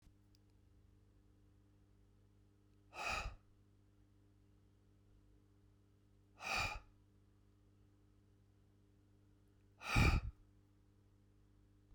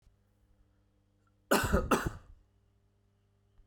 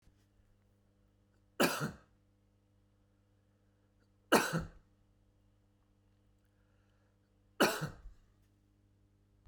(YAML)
exhalation_length: 11.9 s
exhalation_amplitude: 3046
exhalation_signal_mean_std_ratio: 0.26
cough_length: 3.7 s
cough_amplitude: 8368
cough_signal_mean_std_ratio: 0.31
three_cough_length: 9.5 s
three_cough_amplitude: 9897
three_cough_signal_mean_std_ratio: 0.23
survey_phase: beta (2021-08-13 to 2022-03-07)
age: 45-64
gender: Male
wearing_mask: 'No'
symptom_cough_any: true
symptom_runny_or_blocked_nose: true
symptom_sore_throat: true
symptom_abdominal_pain: true
symptom_fatigue: true
symptom_headache: true
symptom_change_to_sense_of_smell_or_taste: true
symptom_loss_of_taste: true
symptom_onset: 8 days
smoker_status: Never smoked
respiratory_condition_asthma: false
respiratory_condition_other: false
recruitment_source: Test and Trace
submission_delay: 2 days
covid_test_result: Positive
covid_test_method: RT-qPCR